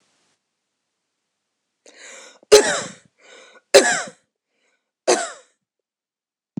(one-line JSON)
{"three_cough_length": "6.6 s", "three_cough_amplitude": 26028, "three_cough_signal_mean_std_ratio": 0.24, "survey_phase": "beta (2021-08-13 to 2022-03-07)", "age": "65+", "gender": "Female", "wearing_mask": "No", "symptom_none": true, "symptom_onset": "12 days", "smoker_status": "Never smoked", "respiratory_condition_asthma": false, "respiratory_condition_other": false, "recruitment_source": "REACT", "submission_delay": "2 days", "covid_test_result": "Negative", "covid_test_method": "RT-qPCR", "influenza_a_test_result": "Negative", "influenza_b_test_result": "Negative"}